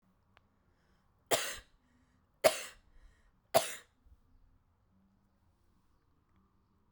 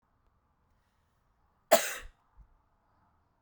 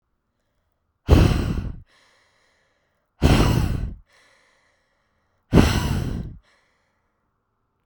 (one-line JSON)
{"three_cough_length": "6.9 s", "three_cough_amplitude": 9771, "three_cough_signal_mean_std_ratio": 0.2, "cough_length": "3.4 s", "cough_amplitude": 15750, "cough_signal_mean_std_ratio": 0.17, "exhalation_length": "7.9 s", "exhalation_amplitude": 32767, "exhalation_signal_mean_std_ratio": 0.37, "survey_phase": "beta (2021-08-13 to 2022-03-07)", "age": "18-44", "gender": "Female", "wearing_mask": "No", "symptom_cough_any": true, "symptom_runny_or_blocked_nose": true, "symptom_shortness_of_breath": true, "symptom_sore_throat": true, "symptom_fever_high_temperature": true, "symptom_change_to_sense_of_smell_or_taste": true, "symptom_onset": "3 days", "smoker_status": "Never smoked", "respiratory_condition_asthma": true, "respiratory_condition_other": false, "recruitment_source": "Test and Trace", "submission_delay": "2 days", "covid_test_result": "Positive", "covid_test_method": "ePCR"}